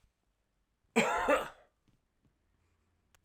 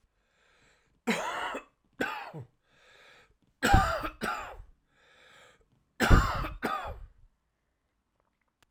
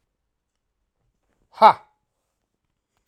{"cough_length": "3.2 s", "cough_amplitude": 5589, "cough_signal_mean_std_ratio": 0.31, "three_cough_length": "8.7 s", "three_cough_amplitude": 18124, "three_cough_signal_mean_std_ratio": 0.34, "exhalation_length": "3.1 s", "exhalation_amplitude": 32768, "exhalation_signal_mean_std_ratio": 0.15, "survey_phase": "alpha (2021-03-01 to 2021-08-12)", "age": "45-64", "gender": "Male", "wearing_mask": "No", "symptom_none": true, "smoker_status": "Current smoker (1 to 10 cigarettes per day)", "respiratory_condition_asthma": false, "respiratory_condition_other": false, "recruitment_source": "REACT", "submission_delay": "1 day", "covid_test_result": "Negative", "covid_test_method": "RT-qPCR"}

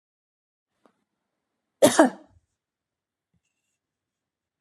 {"cough_length": "4.6 s", "cough_amplitude": 25984, "cough_signal_mean_std_ratio": 0.17, "survey_phase": "beta (2021-08-13 to 2022-03-07)", "age": "45-64", "gender": "Female", "wearing_mask": "No", "symptom_none": true, "smoker_status": "Never smoked", "respiratory_condition_asthma": false, "respiratory_condition_other": false, "recruitment_source": "REACT", "submission_delay": "14 days", "covid_test_result": "Negative", "covid_test_method": "RT-qPCR"}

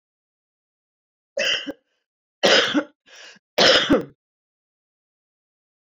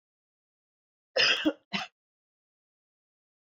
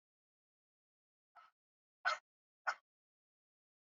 {"three_cough_length": "5.8 s", "three_cough_amplitude": 26701, "three_cough_signal_mean_std_ratio": 0.34, "cough_length": "3.4 s", "cough_amplitude": 8649, "cough_signal_mean_std_ratio": 0.27, "exhalation_length": "3.8 s", "exhalation_amplitude": 2216, "exhalation_signal_mean_std_ratio": 0.17, "survey_phase": "beta (2021-08-13 to 2022-03-07)", "age": "45-64", "gender": "Female", "wearing_mask": "No", "symptom_sore_throat": true, "symptom_headache": true, "symptom_onset": "2 days", "smoker_status": "Ex-smoker", "respiratory_condition_asthma": false, "respiratory_condition_other": false, "recruitment_source": "REACT", "submission_delay": "1 day", "covid_test_result": "Negative", "covid_test_method": "RT-qPCR"}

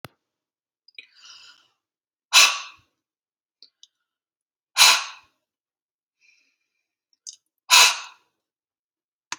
{"exhalation_length": "9.4 s", "exhalation_amplitude": 32768, "exhalation_signal_mean_std_ratio": 0.22, "survey_phase": "alpha (2021-03-01 to 2021-08-12)", "age": "45-64", "gender": "Female", "wearing_mask": "No", "symptom_none": true, "smoker_status": "Never smoked", "respiratory_condition_asthma": false, "respiratory_condition_other": false, "recruitment_source": "REACT", "submission_delay": "3 days", "covid_test_result": "Negative", "covid_test_method": "RT-qPCR"}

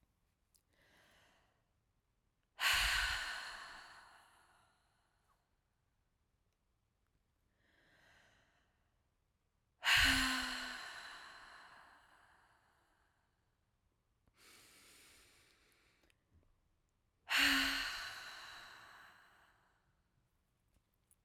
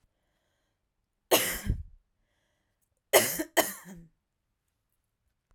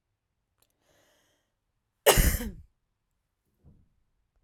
{"exhalation_length": "21.2 s", "exhalation_amplitude": 3898, "exhalation_signal_mean_std_ratio": 0.3, "three_cough_length": "5.5 s", "three_cough_amplitude": 18051, "three_cough_signal_mean_std_ratio": 0.27, "cough_length": "4.4 s", "cough_amplitude": 24669, "cough_signal_mean_std_ratio": 0.22, "survey_phase": "beta (2021-08-13 to 2022-03-07)", "age": "18-44", "gender": "Female", "wearing_mask": "No", "symptom_runny_or_blocked_nose": true, "symptom_shortness_of_breath": true, "symptom_fatigue": true, "symptom_fever_high_temperature": true, "symptom_change_to_sense_of_smell_or_taste": true, "symptom_loss_of_taste": true, "symptom_onset": "4 days", "smoker_status": "Never smoked", "respiratory_condition_asthma": true, "respiratory_condition_other": false, "recruitment_source": "Test and Trace", "submission_delay": "1 day", "covid_test_result": "Positive", "covid_test_method": "RT-qPCR"}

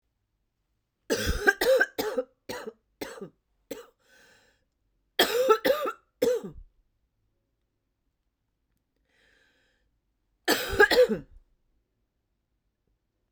{"three_cough_length": "13.3 s", "three_cough_amplitude": 16439, "three_cough_signal_mean_std_ratio": 0.33, "survey_phase": "beta (2021-08-13 to 2022-03-07)", "age": "45-64", "gender": "Female", "wearing_mask": "No", "symptom_cough_any": true, "symptom_runny_or_blocked_nose": true, "symptom_fatigue": true, "smoker_status": "Ex-smoker", "respiratory_condition_asthma": true, "respiratory_condition_other": false, "recruitment_source": "Test and Trace", "submission_delay": "2 days", "covid_test_result": "Positive", "covid_test_method": "RT-qPCR", "covid_ct_value": 23.1, "covid_ct_gene": "ORF1ab gene", "covid_ct_mean": 23.9, "covid_viral_load": "15000 copies/ml", "covid_viral_load_category": "Low viral load (10K-1M copies/ml)"}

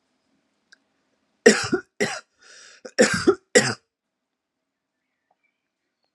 {"cough_length": "6.1 s", "cough_amplitude": 32768, "cough_signal_mean_std_ratio": 0.26, "survey_phase": "alpha (2021-03-01 to 2021-08-12)", "age": "18-44", "gender": "Female", "wearing_mask": "No", "symptom_none": true, "smoker_status": "Current smoker (11 or more cigarettes per day)", "respiratory_condition_asthma": false, "respiratory_condition_other": false, "recruitment_source": "REACT", "submission_delay": "2 days", "covid_test_result": "Negative", "covid_test_method": "RT-qPCR"}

